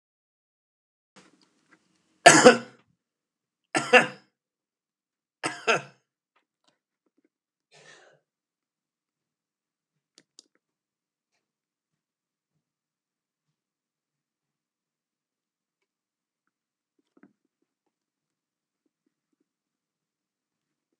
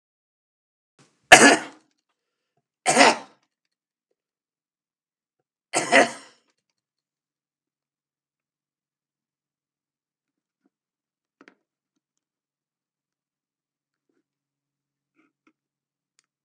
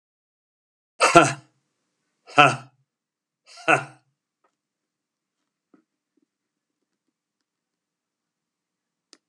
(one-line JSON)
{"three_cough_length": "21.0 s", "three_cough_amplitude": 32768, "three_cough_signal_mean_std_ratio": 0.12, "cough_length": "16.4 s", "cough_amplitude": 32768, "cough_signal_mean_std_ratio": 0.16, "exhalation_length": "9.3 s", "exhalation_amplitude": 32768, "exhalation_signal_mean_std_ratio": 0.18, "survey_phase": "alpha (2021-03-01 to 2021-08-12)", "age": "65+", "gender": "Male", "wearing_mask": "No", "symptom_none": true, "symptom_cough_any": true, "smoker_status": "Ex-smoker", "respiratory_condition_asthma": false, "respiratory_condition_other": false, "recruitment_source": "REACT", "submission_delay": "3 days", "covid_test_result": "Negative", "covid_test_method": "RT-qPCR"}